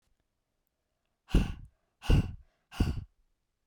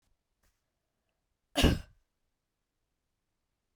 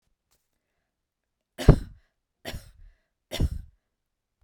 {
  "exhalation_length": "3.7 s",
  "exhalation_amplitude": 8278,
  "exhalation_signal_mean_std_ratio": 0.31,
  "cough_length": "3.8 s",
  "cough_amplitude": 8515,
  "cough_signal_mean_std_ratio": 0.18,
  "three_cough_length": "4.4 s",
  "three_cough_amplitude": 29056,
  "three_cough_signal_mean_std_ratio": 0.18,
  "survey_phase": "beta (2021-08-13 to 2022-03-07)",
  "age": "45-64",
  "gender": "Female",
  "wearing_mask": "No",
  "symptom_none": true,
  "smoker_status": "Ex-smoker",
  "respiratory_condition_asthma": false,
  "respiratory_condition_other": false,
  "recruitment_source": "REACT",
  "submission_delay": "2 days",
  "covid_test_result": "Negative",
  "covid_test_method": "RT-qPCR"
}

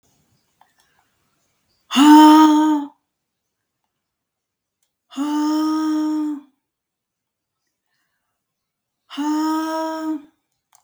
{
  "exhalation_length": "10.8 s",
  "exhalation_amplitude": 32768,
  "exhalation_signal_mean_std_ratio": 0.38,
  "survey_phase": "beta (2021-08-13 to 2022-03-07)",
  "age": "45-64",
  "gender": "Female",
  "wearing_mask": "No",
  "symptom_none": true,
  "smoker_status": "Never smoked",
  "respiratory_condition_asthma": false,
  "respiratory_condition_other": false,
  "recruitment_source": "REACT",
  "submission_delay": "3 days",
  "covid_test_result": "Negative",
  "covid_test_method": "RT-qPCR",
  "influenza_a_test_result": "Negative",
  "influenza_b_test_result": "Negative"
}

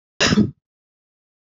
{
  "cough_length": "1.5 s",
  "cough_amplitude": 22471,
  "cough_signal_mean_std_ratio": 0.34,
  "survey_phase": "beta (2021-08-13 to 2022-03-07)",
  "age": "45-64",
  "gender": "Female",
  "wearing_mask": "No",
  "symptom_none": true,
  "smoker_status": "Never smoked",
  "respiratory_condition_asthma": false,
  "respiratory_condition_other": false,
  "recruitment_source": "REACT",
  "submission_delay": "1 day",
  "covid_test_result": "Negative",
  "covid_test_method": "RT-qPCR"
}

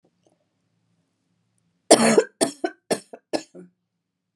{
  "cough_length": "4.4 s",
  "cough_amplitude": 32767,
  "cough_signal_mean_std_ratio": 0.26,
  "survey_phase": "alpha (2021-03-01 to 2021-08-12)",
  "age": "45-64",
  "gender": "Female",
  "wearing_mask": "No",
  "symptom_cough_any": true,
  "smoker_status": "Ex-smoker",
  "respiratory_condition_asthma": false,
  "respiratory_condition_other": false,
  "recruitment_source": "REACT",
  "submission_delay": "3 days",
  "covid_test_result": "Negative",
  "covid_test_method": "RT-qPCR"
}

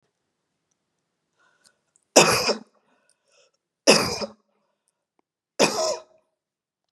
{
  "three_cough_length": "6.9 s",
  "three_cough_amplitude": 32628,
  "three_cough_signal_mean_std_ratio": 0.28,
  "survey_phase": "beta (2021-08-13 to 2022-03-07)",
  "age": "45-64",
  "gender": "Female",
  "wearing_mask": "No",
  "symptom_none": true,
  "smoker_status": "Never smoked",
  "respiratory_condition_asthma": false,
  "respiratory_condition_other": false,
  "recruitment_source": "REACT",
  "submission_delay": "3 days",
  "covid_test_result": "Negative",
  "covid_test_method": "RT-qPCR"
}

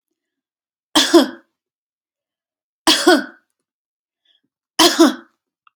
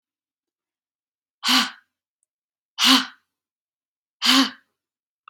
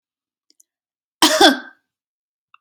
{
  "three_cough_length": "5.8 s",
  "three_cough_amplitude": 32768,
  "three_cough_signal_mean_std_ratio": 0.31,
  "exhalation_length": "5.3 s",
  "exhalation_amplitude": 30579,
  "exhalation_signal_mean_std_ratio": 0.29,
  "cough_length": "2.6 s",
  "cough_amplitude": 32768,
  "cough_signal_mean_std_ratio": 0.27,
  "survey_phase": "beta (2021-08-13 to 2022-03-07)",
  "age": "18-44",
  "gender": "Female",
  "wearing_mask": "No",
  "symptom_none": true,
  "symptom_onset": "12 days",
  "smoker_status": "Ex-smoker",
  "respiratory_condition_asthma": false,
  "respiratory_condition_other": false,
  "recruitment_source": "REACT",
  "submission_delay": "4 days",
  "covid_test_result": "Negative",
  "covid_test_method": "RT-qPCR",
  "influenza_a_test_result": "Negative",
  "influenza_b_test_result": "Negative"
}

